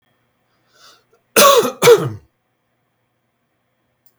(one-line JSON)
{"cough_length": "4.2 s", "cough_amplitude": 32768, "cough_signal_mean_std_ratio": 0.3, "survey_phase": "beta (2021-08-13 to 2022-03-07)", "age": "45-64", "gender": "Male", "wearing_mask": "No", "symptom_none": true, "smoker_status": "Never smoked", "respiratory_condition_asthma": false, "respiratory_condition_other": false, "recruitment_source": "REACT", "submission_delay": "0 days", "covid_test_method": "RT-qPCR", "influenza_a_test_result": "Unknown/Void", "influenza_b_test_result": "Unknown/Void"}